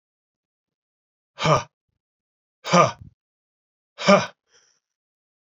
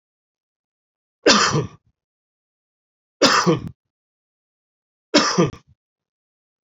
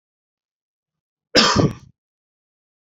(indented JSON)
{
  "exhalation_length": "5.5 s",
  "exhalation_amplitude": 27803,
  "exhalation_signal_mean_std_ratio": 0.25,
  "three_cough_length": "6.7 s",
  "three_cough_amplitude": 31829,
  "three_cough_signal_mean_std_ratio": 0.32,
  "cough_length": "2.8 s",
  "cough_amplitude": 29927,
  "cough_signal_mean_std_ratio": 0.28,
  "survey_phase": "beta (2021-08-13 to 2022-03-07)",
  "age": "45-64",
  "gender": "Male",
  "wearing_mask": "No",
  "symptom_abdominal_pain": true,
  "symptom_fatigue": true,
  "symptom_headache": true,
  "symptom_onset": "12 days",
  "smoker_status": "Ex-smoker",
  "respiratory_condition_asthma": false,
  "respiratory_condition_other": false,
  "recruitment_source": "REACT",
  "submission_delay": "2 days",
  "covid_test_result": "Negative",
  "covid_test_method": "RT-qPCR"
}